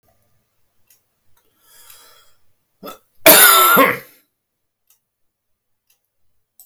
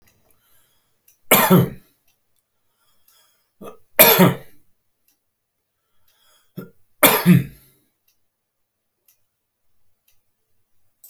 {"cough_length": "6.7 s", "cough_amplitude": 32768, "cough_signal_mean_std_ratio": 0.27, "three_cough_length": "11.1 s", "three_cough_amplitude": 32768, "three_cough_signal_mean_std_ratio": 0.25, "survey_phase": "beta (2021-08-13 to 2022-03-07)", "age": "65+", "gender": "Male", "wearing_mask": "No", "symptom_none": true, "smoker_status": "Ex-smoker", "respiratory_condition_asthma": false, "respiratory_condition_other": false, "recruitment_source": "REACT", "submission_delay": "0 days", "covid_test_result": "Negative", "covid_test_method": "RT-qPCR"}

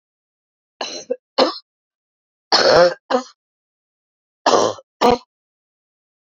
{"three_cough_length": "6.2 s", "three_cough_amplitude": 32399, "three_cough_signal_mean_std_ratio": 0.34, "survey_phase": "beta (2021-08-13 to 2022-03-07)", "age": "45-64", "gender": "Female", "wearing_mask": "No", "symptom_shortness_of_breath": true, "symptom_fatigue": true, "symptom_other": true, "symptom_onset": "13 days", "smoker_status": "Ex-smoker", "respiratory_condition_asthma": false, "respiratory_condition_other": false, "recruitment_source": "REACT", "submission_delay": "2 days", "covid_test_result": "Negative", "covid_test_method": "RT-qPCR", "influenza_a_test_result": "Unknown/Void", "influenza_b_test_result": "Unknown/Void"}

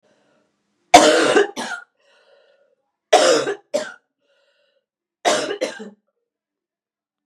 {"three_cough_length": "7.3 s", "three_cough_amplitude": 32768, "three_cough_signal_mean_std_ratio": 0.34, "survey_phase": "beta (2021-08-13 to 2022-03-07)", "age": "18-44", "gender": "Female", "wearing_mask": "No", "symptom_new_continuous_cough": true, "symptom_runny_or_blocked_nose": true, "symptom_sore_throat": true, "symptom_fatigue": true, "symptom_headache": true, "smoker_status": "Never smoked", "respiratory_condition_asthma": false, "respiratory_condition_other": false, "recruitment_source": "Test and Trace", "submission_delay": "1 day", "covid_test_result": "Positive", "covid_test_method": "LFT"}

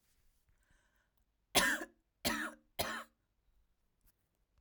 {"three_cough_length": "4.6 s", "three_cough_amplitude": 7045, "three_cough_signal_mean_std_ratio": 0.3, "survey_phase": "alpha (2021-03-01 to 2021-08-12)", "age": "18-44", "gender": "Female", "wearing_mask": "No", "symptom_none": true, "smoker_status": "Ex-smoker", "respiratory_condition_asthma": false, "respiratory_condition_other": false, "recruitment_source": "REACT", "submission_delay": "1 day", "covid_test_result": "Negative", "covid_test_method": "RT-qPCR"}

